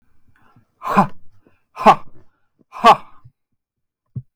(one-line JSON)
{"exhalation_length": "4.4 s", "exhalation_amplitude": 32768, "exhalation_signal_mean_std_ratio": 0.29, "survey_phase": "beta (2021-08-13 to 2022-03-07)", "age": "18-44", "gender": "Male", "wearing_mask": "No", "symptom_none": true, "smoker_status": "Never smoked", "respiratory_condition_asthma": false, "respiratory_condition_other": false, "recruitment_source": "REACT", "submission_delay": "0 days", "covid_test_result": "Negative", "covid_test_method": "RT-qPCR", "influenza_a_test_result": "Negative", "influenza_b_test_result": "Negative"}